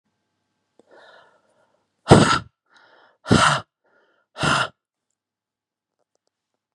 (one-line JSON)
{"exhalation_length": "6.7 s", "exhalation_amplitude": 32768, "exhalation_signal_mean_std_ratio": 0.26, "survey_phase": "beta (2021-08-13 to 2022-03-07)", "age": "45-64", "gender": "Male", "wearing_mask": "No", "symptom_none": true, "smoker_status": "Never smoked", "respiratory_condition_asthma": false, "respiratory_condition_other": false, "recruitment_source": "REACT", "submission_delay": "1 day", "covid_test_result": "Negative", "covid_test_method": "RT-qPCR"}